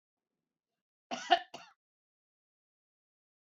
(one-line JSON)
{"cough_length": "3.4 s", "cough_amplitude": 9268, "cough_signal_mean_std_ratio": 0.16, "survey_phase": "beta (2021-08-13 to 2022-03-07)", "age": "65+", "gender": "Female", "wearing_mask": "No", "symptom_none": true, "smoker_status": "Never smoked", "respiratory_condition_asthma": false, "respiratory_condition_other": false, "recruitment_source": "REACT", "submission_delay": "0 days", "covid_test_result": "Negative", "covid_test_method": "RT-qPCR", "influenza_a_test_result": "Negative", "influenza_b_test_result": "Negative"}